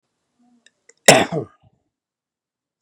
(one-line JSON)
{"cough_length": "2.8 s", "cough_amplitude": 32768, "cough_signal_mean_std_ratio": 0.21, "survey_phase": "beta (2021-08-13 to 2022-03-07)", "age": "45-64", "gender": "Male", "wearing_mask": "No", "symptom_new_continuous_cough": true, "symptom_runny_or_blocked_nose": true, "symptom_onset": "7 days", "smoker_status": "Never smoked", "respiratory_condition_asthma": false, "respiratory_condition_other": false, "recruitment_source": "Test and Trace", "submission_delay": "1 day", "covid_test_result": "Positive", "covid_test_method": "RT-qPCR", "covid_ct_value": 19.0, "covid_ct_gene": "ORF1ab gene"}